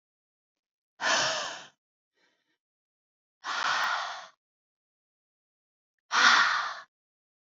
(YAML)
exhalation_length: 7.4 s
exhalation_amplitude: 13987
exhalation_signal_mean_std_ratio: 0.37
survey_phase: beta (2021-08-13 to 2022-03-07)
age: 18-44
gender: Female
wearing_mask: 'No'
symptom_cough_any: true
symptom_sore_throat: true
symptom_onset: 5 days
smoker_status: Never smoked
respiratory_condition_asthma: false
respiratory_condition_other: false
recruitment_source: REACT
submission_delay: 4 days
covid_test_result: Negative
covid_test_method: RT-qPCR
influenza_a_test_result: Negative
influenza_b_test_result: Negative